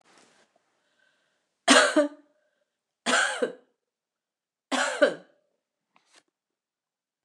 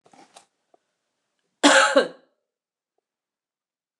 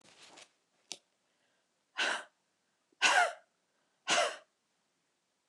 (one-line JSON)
{"three_cough_length": "7.2 s", "three_cough_amplitude": 26799, "three_cough_signal_mean_std_ratio": 0.29, "cough_length": "4.0 s", "cough_amplitude": 26598, "cough_signal_mean_std_ratio": 0.25, "exhalation_length": "5.5 s", "exhalation_amplitude": 8571, "exhalation_signal_mean_std_ratio": 0.3, "survey_phase": "beta (2021-08-13 to 2022-03-07)", "age": "45-64", "gender": "Female", "wearing_mask": "No", "symptom_runny_or_blocked_nose": true, "symptom_fatigue": true, "symptom_headache": true, "symptom_change_to_sense_of_smell_or_taste": true, "symptom_loss_of_taste": true, "symptom_onset": "7 days", "smoker_status": "Never smoked", "respiratory_condition_asthma": true, "respiratory_condition_other": false, "recruitment_source": "Test and Trace", "submission_delay": "2 days", "covid_test_result": "Positive", "covid_test_method": "RT-qPCR", "covid_ct_value": 17.9, "covid_ct_gene": "ORF1ab gene", "covid_ct_mean": 18.3, "covid_viral_load": "990000 copies/ml", "covid_viral_load_category": "Low viral load (10K-1M copies/ml)"}